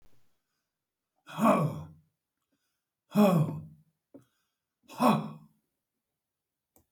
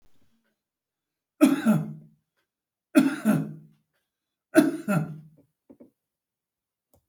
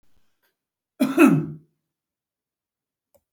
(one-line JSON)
{"exhalation_length": "6.9 s", "exhalation_amplitude": 9961, "exhalation_signal_mean_std_ratio": 0.32, "three_cough_length": "7.1 s", "three_cough_amplitude": 19245, "three_cough_signal_mean_std_ratio": 0.32, "cough_length": "3.3 s", "cough_amplitude": 25460, "cough_signal_mean_std_ratio": 0.27, "survey_phase": "beta (2021-08-13 to 2022-03-07)", "age": "65+", "gender": "Male", "wearing_mask": "No", "symptom_shortness_of_breath": true, "smoker_status": "Ex-smoker", "respiratory_condition_asthma": true, "respiratory_condition_other": true, "recruitment_source": "REACT", "submission_delay": "1 day", "covid_test_result": "Negative", "covid_test_method": "RT-qPCR"}